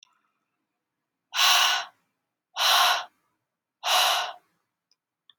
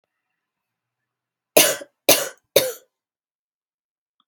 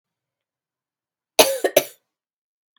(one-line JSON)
{"exhalation_length": "5.4 s", "exhalation_amplitude": 14959, "exhalation_signal_mean_std_ratio": 0.42, "three_cough_length": "4.3 s", "three_cough_amplitude": 32768, "three_cough_signal_mean_std_ratio": 0.24, "cough_length": "2.8 s", "cough_amplitude": 32767, "cough_signal_mean_std_ratio": 0.22, "survey_phase": "beta (2021-08-13 to 2022-03-07)", "age": "18-44", "gender": "Female", "wearing_mask": "No", "symptom_cough_any": true, "symptom_runny_or_blocked_nose": true, "symptom_sore_throat": true, "symptom_fatigue": true, "symptom_headache": true, "symptom_onset": "2 days", "smoker_status": "Never smoked", "respiratory_condition_asthma": false, "respiratory_condition_other": false, "recruitment_source": "REACT", "submission_delay": "4 days", "covid_test_result": "Negative", "covid_test_method": "RT-qPCR", "influenza_a_test_result": "Negative", "influenza_b_test_result": "Negative"}